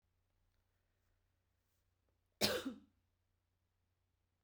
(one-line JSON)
{"cough_length": "4.4 s", "cough_amplitude": 4226, "cough_signal_mean_std_ratio": 0.2, "survey_phase": "beta (2021-08-13 to 2022-03-07)", "age": "45-64", "gender": "Female", "wearing_mask": "No", "symptom_none": true, "smoker_status": "Never smoked", "respiratory_condition_asthma": false, "respiratory_condition_other": false, "recruitment_source": "REACT", "submission_delay": "1 day", "covid_test_result": "Positive", "covid_test_method": "RT-qPCR", "covid_ct_value": 36.0, "covid_ct_gene": "E gene", "influenza_a_test_result": "Negative", "influenza_b_test_result": "Negative"}